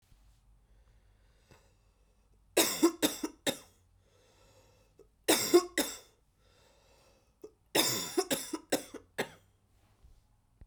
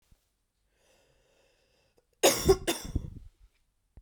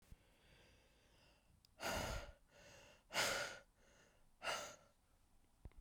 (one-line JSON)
{"three_cough_length": "10.7 s", "three_cough_amplitude": 8767, "three_cough_signal_mean_std_ratio": 0.31, "cough_length": "4.0 s", "cough_amplitude": 12354, "cough_signal_mean_std_ratio": 0.27, "exhalation_length": "5.8 s", "exhalation_amplitude": 1553, "exhalation_signal_mean_std_ratio": 0.43, "survey_phase": "beta (2021-08-13 to 2022-03-07)", "age": "18-44", "gender": "Female", "wearing_mask": "No", "symptom_cough_any": true, "symptom_runny_or_blocked_nose": true, "symptom_fever_high_temperature": true, "smoker_status": "Ex-smoker", "respiratory_condition_asthma": false, "respiratory_condition_other": false, "recruitment_source": "Test and Trace", "submission_delay": "2 days", "covid_test_result": "Positive", "covid_test_method": "LFT"}